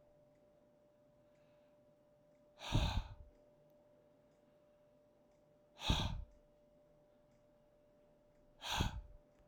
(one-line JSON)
{"exhalation_length": "9.5 s", "exhalation_amplitude": 2822, "exhalation_signal_mean_std_ratio": 0.32, "survey_phase": "alpha (2021-03-01 to 2021-08-12)", "age": "45-64", "gender": "Male", "wearing_mask": "No", "symptom_none": true, "smoker_status": "Current smoker (1 to 10 cigarettes per day)", "respiratory_condition_asthma": false, "respiratory_condition_other": false, "recruitment_source": "REACT", "submission_delay": "1 day", "covid_test_result": "Negative", "covid_test_method": "RT-qPCR"}